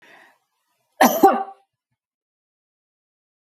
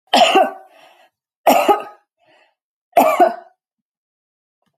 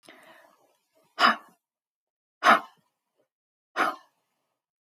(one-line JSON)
{"cough_length": "3.5 s", "cough_amplitude": 30979, "cough_signal_mean_std_ratio": 0.24, "three_cough_length": "4.8 s", "three_cough_amplitude": 31795, "three_cough_signal_mean_std_ratio": 0.38, "exhalation_length": "4.9 s", "exhalation_amplitude": 17000, "exhalation_signal_mean_std_ratio": 0.24, "survey_phase": "beta (2021-08-13 to 2022-03-07)", "age": "45-64", "gender": "Female", "wearing_mask": "No", "symptom_none": true, "smoker_status": "Ex-smoker", "respiratory_condition_asthma": false, "respiratory_condition_other": false, "recruitment_source": "REACT", "submission_delay": "1 day", "covid_test_result": "Negative", "covid_test_method": "RT-qPCR"}